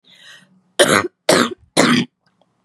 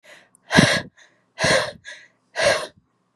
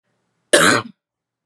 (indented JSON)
{
  "three_cough_length": "2.6 s",
  "three_cough_amplitude": 32767,
  "three_cough_signal_mean_std_ratio": 0.43,
  "exhalation_length": "3.2 s",
  "exhalation_amplitude": 32664,
  "exhalation_signal_mean_std_ratio": 0.42,
  "cough_length": "1.5 s",
  "cough_amplitude": 32739,
  "cough_signal_mean_std_ratio": 0.36,
  "survey_phase": "beta (2021-08-13 to 2022-03-07)",
  "age": "18-44",
  "gender": "Female",
  "wearing_mask": "No",
  "symptom_cough_any": true,
  "symptom_new_continuous_cough": true,
  "symptom_fatigue": true,
  "symptom_headache": true,
  "symptom_onset": "3 days",
  "smoker_status": "Never smoked",
  "respiratory_condition_asthma": true,
  "respiratory_condition_other": false,
  "recruitment_source": "Test and Trace",
  "submission_delay": "1 day",
  "covid_test_result": "Positive",
  "covid_test_method": "RT-qPCR",
  "covid_ct_value": 29.4,
  "covid_ct_gene": "N gene"
}